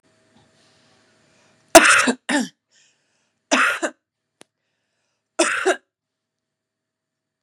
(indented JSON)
{
  "three_cough_length": "7.4 s",
  "three_cough_amplitude": 32768,
  "three_cough_signal_mean_std_ratio": 0.28,
  "survey_phase": "beta (2021-08-13 to 2022-03-07)",
  "age": "45-64",
  "gender": "Female",
  "wearing_mask": "No",
  "symptom_fatigue": true,
  "symptom_headache": true,
  "symptom_other": true,
  "smoker_status": "Ex-smoker",
  "respiratory_condition_asthma": false,
  "respiratory_condition_other": false,
  "recruitment_source": "Test and Trace",
  "submission_delay": "1 day",
  "covid_test_result": "Positive",
  "covid_test_method": "RT-qPCR",
  "covid_ct_value": 16.3,
  "covid_ct_gene": "ORF1ab gene"
}